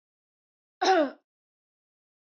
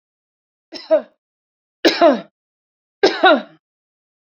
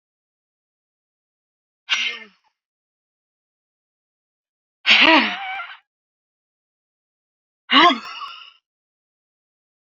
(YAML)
cough_length: 2.3 s
cough_amplitude: 8917
cough_signal_mean_std_ratio: 0.27
three_cough_length: 4.3 s
three_cough_amplitude: 32214
three_cough_signal_mean_std_ratio: 0.33
exhalation_length: 9.9 s
exhalation_amplitude: 29726
exhalation_signal_mean_std_ratio: 0.25
survey_phase: beta (2021-08-13 to 2022-03-07)
age: 65+
gender: Female
wearing_mask: 'No'
symptom_none: true
smoker_status: Ex-smoker
respiratory_condition_asthma: false
respiratory_condition_other: false
recruitment_source: REACT
submission_delay: 1 day
covid_test_result: Negative
covid_test_method: RT-qPCR
influenza_a_test_result: Unknown/Void
influenza_b_test_result: Unknown/Void